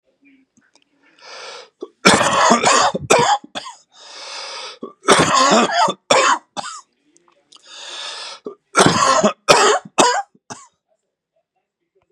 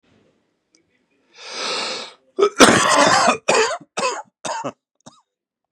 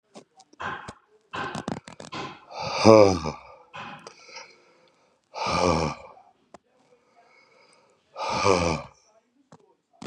three_cough_length: 12.1 s
three_cough_amplitude: 32768
three_cough_signal_mean_std_ratio: 0.48
cough_length: 5.7 s
cough_amplitude: 32768
cough_signal_mean_std_ratio: 0.44
exhalation_length: 10.1 s
exhalation_amplitude: 31697
exhalation_signal_mean_std_ratio: 0.33
survey_phase: beta (2021-08-13 to 2022-03-07)
age: 45-64
gender: Male
wearing_mask: 'No'
symptom_cough_any: true
symptom_runny_or_blocked_nose: true
symptom_sore_throat: true
symptom_headache: true
symptom_onset: 4 days
smoker_status: Never smoked
respiratory_condition_asthma: false
respiratory_condition_other: false
recruitment_source: Test and Trace
submission_delay: 1 day
covid_test_result: Positive
covid_test_method: RT-qPCR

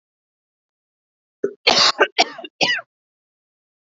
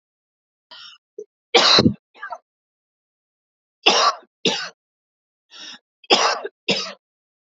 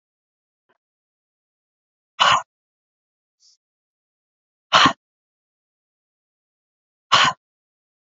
cough_length: 3.9 s
cough_amplitude: 32597
cough_signal_mean_std_ratio: 0.31
three_cough_length: 7.5 s
three_cough_amplitude: 32768
three_cough_signal_mean_std_ratio: 0.33
exhalation_length: 8.1 s
exhalation_amplitude: 32767
exhalation_signal_mean_std_ratio: 0.21
survey_phase: beta (2021-08-13 to 2022-03-07)
age: 18-44
gender: Female
wearing_mask: 'No'
symptom_none: true
smoker_status: Ex-smoker
respiratory_condition_asthma: false
respiratory_condition_other: false
recruitment_source: REACT
submission_delay: 3 days
covid_test_result: Negative
covid_test_method: RT-qPCR
influenza_a_test_result: Negative
influenza_b_test_result: Negative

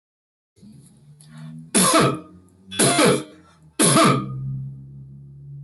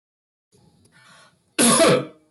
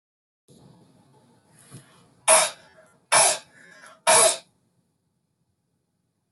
three_cough_length: 5.6 s
three_cough_amplitude: 21887
three_cough_signal_mean_std_ratio: 0.49
cough_length: 2.3 s
cough_amplitude: 21331
cough_signal_mean_std_ratio: 0.38
exhalation_length: 6.3 s
exhalation_amplitude: 19996
exhalation_signal_mean_std_ratio: 0.29
survey_phase: beta (2021-08-13 to 2022-03-07)
age: 65+
gender: Male
wearing_mask: 'No'
symptom_none: true
smoker_status: Ex-smoker
respiratory_condition_asthma: false
respiratory_condition_other: false
recruitment_source: REACT
submission_delay: 0 days
covid_test_result: Negative
covid_test_method: RT-qPCR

